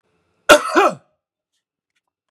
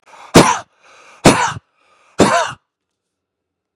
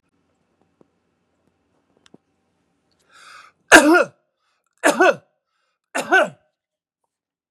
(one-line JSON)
{"cough_length": "2.3 s", "cough_amplitude": 32768, "cough_signal_mean_std_ratio": 0.28, "exhalation_length": "3.8 s", "exhalation_amplitude": 32768, "exhalation_signal_mean_std_ratio": 0.35, "three_cough_length": "7.5 s", "three_cough_amplitude": 32768, "three_cough_signal_mean_std_ratio": 0.25, "survey_phase": "beta (2021-08-13 to 2022-03-07)", "age": "45-64", "gender": "Male", "wearing_mask": "No", "symptom_change_to_sense_of_smell_or_taste": true, "smoker_status": "Ex-smoker", "respiratory_condition_asthma": false, "respiratory_condition_other": false, "recruitment_source": "REACT", "submission_delay": "3 days", "covid_test_result": "Negative", "covid_test_method": "RT-qPCR", "influenza_a_test_result": "Negative", "influenza_b_test_result": "Negative"}